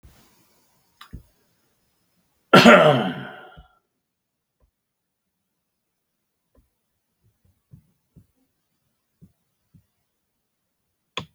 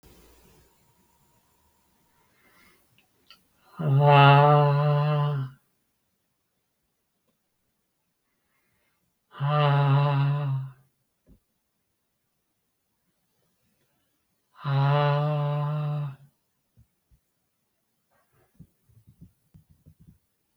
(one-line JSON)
{"cough_length": "11.3 s", "cough_amplitude": 32768, "cough_signal_mean_std_ratio": 0.18, "exhalation_length": "20.6 s", "exhalation_amplitude": 18827, "exhalation_signal_mean_std_ratio": 0.38, "survey_phase": "beta (2021-08-13 to 2022-03-07)", "age": "65+", "gender": "Male", "wearing_mask": "No", "symptom_runny_or_blocked_nose": true, "symptom_fatigue": true, "smoker_status": "Never smoked", "respiratory_condition_asthma": false, "respiratory_condition_other": false, "recruitment_source": "REACT", "submission_delay": "2 days", "covid_test_result": "Negative", "covid_test_method": "RT-qPCR"}